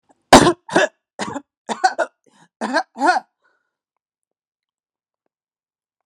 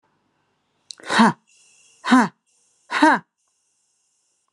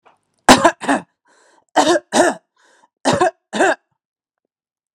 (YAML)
three_cough_length: 6.1 s
three_cough_amplitude: 32768
three_cough_signal_mean_std_ratio: 0.28
exhalation_length: 4.5 s
exhalation_amplitude: 29550
exhalation_signal_mean_std_ratio: 0.3
cough_length: 4.9 s
cough_amplitude: 32768
cough_signal_mean_std_ratio: 0.38
survey_phase: alpha (2021-03-01 to 2021-08-12)
age: 18-44
gender: Male
wearing_mask: 'No'
symptom_abdominal_pain: true
symptom_diarrhoea: true
symptom_headache: true
symptom_onset: 4 days
smoker_status: Never smoked
respiratory_condition_asthma: false
respiratory_condition_other: false
recruitment_source: REACT
submission_delay: 1 day
covid_test_result: Negative
covid_test_method: RT-qPCR